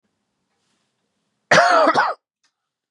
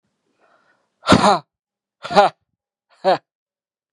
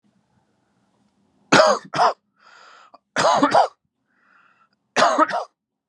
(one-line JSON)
{"cough_length": "2.9 s", "cough_amplitude": 32767, "cough_signal_mean_std_ratio": 0.37, "exhalation_length": "3.9 s", "exhalation_amplitude": 32767, "exhalation_signal_mean_std_ratio": 0.3, "three_cough_length": "5.9 s", "three_cough_amplitude": 32091, "three_cough_signal_mean_std_ratio": 0.38, "survey_phase": "beta (2021-08-13 to 2022-03-07)", "age": "18-44", "gender": "Male", "wearing_mask": "No", "symptom_fatigue": true, "symptom_onset": "10 days", "smoker_status": "Never smoked", "respiratory_condition_asthma": false, "respiratory_condition_other": false, "recruitment_source": "REACT", "submission_delay": "1 day", "covid_test_result": "Negative", "covid_test_method": "RT-qPCR"}